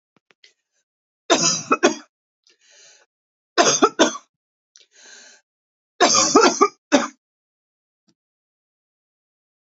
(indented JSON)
{
  "three_cough_length": "9.7 s",
  "three_cough_amplitude": 32692,
  "three_cough_signal_mean_std_ratio": 0.31,
  "survey_phase": "beta (2021-08-13 to 2022-03-07)",
  "age": "18-44",
  "gender": "Female",
  "wearing_mask": "No",
  "symptom_cough_any": true,
  "symptom_runny_or_blocked_nose": true,
  "symptom_sore_throat": true,
  "symptom_fatigue": true,
  "symptom_headache": true,
  "symptom_onset": "3 days",
  "smoker_status": "Never smoked",
  "respiratory_condition_asthma": false,
  "respiratory_condition_other": false,
  "recruitment_source": "Test and Trace",
  "submission_delay": "2 days",
  "covid_test_result": "Positive",
  "covid_test_method": "RT-qPCR",
  "covid_ct_value": 23.5,
  "covid_ct_gene": "N gene",
  "covid_ct_mean": 23.8,
  "covid_viral_load": "16000 copies/ml",
  "covid_viral_load_category": "Low viral load (10K-1M copies/ml)"
}